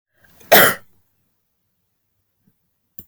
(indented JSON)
{
  "cough_length": "3.1 s",
  "cough_amplitude": 32768,
  "cough_signal_mean_std_ratio": 0.22,
  "survey_phase": "alpha (2021-03-01 to 2021-08-12)",
  "age": "45-64",
  "gender": "Female",
  "wearing_mask": "No",
  "symptom_none": true,
  "smoker_status": "Never smoked",
  "respiratory_condition_asthma": false,
  "respiratory_condition_other": false,
  "recruitment_source": "REACT",
  "submission_delay": "1 day",
  "covid_test_result": "Negative",
  "covid_test_method": "RT-qPCR"
}